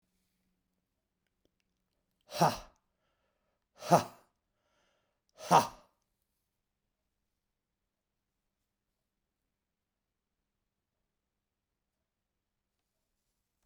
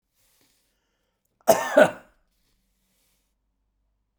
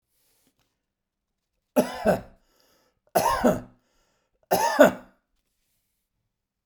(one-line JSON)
{"exhalation_length": "13.7 s", "exhalation_amplitude": 10978, "exhalation_signal_mean_std_ratio": 0.14, "cough_length": "4.2 s", "cough_amplitude": 23596, "cough_signal_mean_std_ratio": 0.2, "three_cough_length": "6.7 s", "three_cough_amplitude": 24901, "three_cough_signal_mean_std_ratio": 0.3, "survey_phase": "beta (2021-08-13 to 2022-03-07)", "age": "65+", "gender": "Male", "wearing_mask": "No", "symptom_none": true, "smoker_status": "Never smoked", "respiratory_condition_asthma": false, "respiratory_condition_other": false, "recruitment_source": "REACT", "submission_delay": "3 days", "covid_test_result": "Negative", "covid_test_method": "RT-qPCR"}